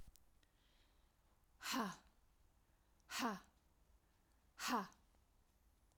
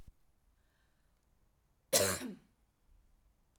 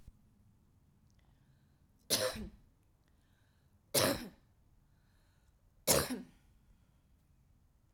{
  "exhalation_length": "6.0 s",
  "exhalation_amplitude": 1177,
  "exhalation_signal_mean_std_ratio": 0.35,
  "cough_length": "3.6 s",
  "cough_amplitude": 7410,
  "cough_signal_mean_std_ratio": 0.25,
  "three_cough_length": "7.9 s",
  "three_cough_amplitude": 6824,
  "three_cough_signal_mean_std_ratio": 0.28,
  "survey_phase": "alpha (2021-03-01 to 2021-08-12)",
  "age": "45-64",
  "gender": "Female",
  "wearing_mask": "No",
  "symptom_fatigue": true,
  "symptom_headache": true,
  "smoker_status": "Never smoked",
  "respiratory_condition_asthma": false,
  "respiratory_condition_other": false,
  "recruitment_source": "Test and Trace",
  "submission_delay": "2 days",
  "covid_test_result": "Positive",
  "covid_test_method": "RT-qPCR",
  "covid_ct_value": 31.1,
  "covid_ct_gene": "ORF1ab gene",
  "covid_ct_mean": 32.2,
  "covid_viral_load": "28 copies/ml",
  "covid_viral_load_category": "Minimal viral load (< 10K copies/ml)"
}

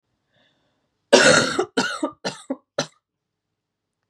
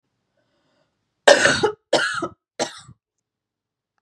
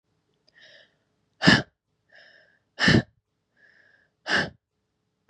{
  "cough_length": "4.1 s",
  "cough_amplitude": 32519,
  "cough_signal_mean_std_ratio": 0.33,
  "three_cough_length": "4.0 s",
  "three_cough_amplitude": 32767,
  "three_cough_signal_mean_std_ratio": 0.31,
  "exhalation_length": "5.3 s",
  "exhalation_amplitude": 26340,
  "exhalation_signal_mean_std_ratio": 0.26,
  "survey_phase": "beta (2021-08-13 to 2022-03-07)",
  "age": "18-44",
  "gender": "Female",
  "wearing_mask": "No",
  "symptom_cough_any": true,
  "symptom_new_continuous_cough": true,
  "symptom_sore_throat": true,
  "symptom_fatigue": true,
  "symptom_headache": true,
  "symptom_onset": "2 days",
  "smoker_status": "Never smoked",
  "respiratory_condition_asthma": false,
  "respiratory_condition_other": false,
  "recruitment_source": "Test and Trace",
  "submission_delay": "1 day",
  "covid_test_result": "Positive",
  "covid_test_method": "RT-qPCR",
  "covid_ct_value": 24.7,
  "covid_ct_gene": "N gene",
  "covid_ct_mean": 25.1,
  "covid_viral_load": "5900 copies/ml",
  "covid_viral_load_category": "Minimal viral load (< 10K copies/ml)"
}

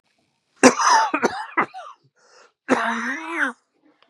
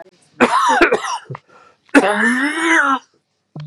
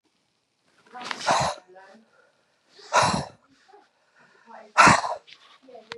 {
  "cough_length": "4.1 s",
  "cough_amplitude": 32720,
  "cough_signal_mean_std_ratio": 0.44,
  "three_cough_length": "3.7 s",
  "three_cough_amplitude": 32768,
  "three_cough_signal_mean_std_ratio": 0.6,
  "exhalation_length": "6.0 s",
  "exhalation_amplitude": 25669,
  "exhalation_signal_mean_std_ratio": 0.32,
  "survey_phase": "beta (2021-08-13 to 2022-03-07)",
  "age": "45-64",
  "gender": "Female",
  "wearing_mask": "No",
  "symptom_cough_any": true,
  "symptom_runny_or_blocked_nose": true,
  "symptom_sore_throat": true,
  "symptom_fatigue": true,
  "symptom_other": true,
  "symptom_onset": "11 days",
  "smoker_status": "Ex-smoker",
  "respiratory_condition_asthma": true,
  "respiratory_condition_other": false,
  "recruitment_source": "Test and Trace",
  "submission_delay": "8 days",
  "covid_test_result": "Positive",
  "covid_test_method": "RT-qPCR",
  "covid_ct_value": 21.4,
  "covid_ct_gene": "ORF1ab gene"
}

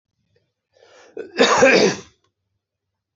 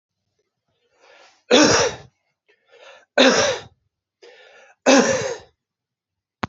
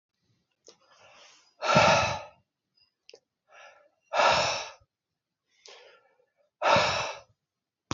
{
  "cough_length": "3.2 s",
  "cough_amplitude": 27201,
  "cough_signal_mean_std_ratio": 0.36,
  "three_cough_length": "6.5 s",
  "three_cough_amplitude": 28639,
  "three_cough_signal_mean_std_ratio": 0.36,
  "exhalation_length": "7.9 s",
  "exhalation_amplitude": 15386,
  "exhalation_signal_mean_std_ratio": 0.36,
  "survey_phase": "beta (2021-08-13 to 2022-03-07)",
  "age": "65+",
  "gender": "Male",
  "wearing_mask": "No",
  "symptom_cough_any": true,
  "symptom_fatigue": true,
  "symptom_onset": "4 days",
  "smoker_status": "Never smoked",
  "respiratory_condition_asthma": false,
  "respiratory_condition_other": false,
  "recruitment_source": "Test and Trace",
  "submission_delay": "2 days",
  "covid_test_result": "Positive",
  "covid_test_method": "RT-qPCR",
  "covid_ct_value": 19.5,
  "covid_ct_gene": "N gene"
}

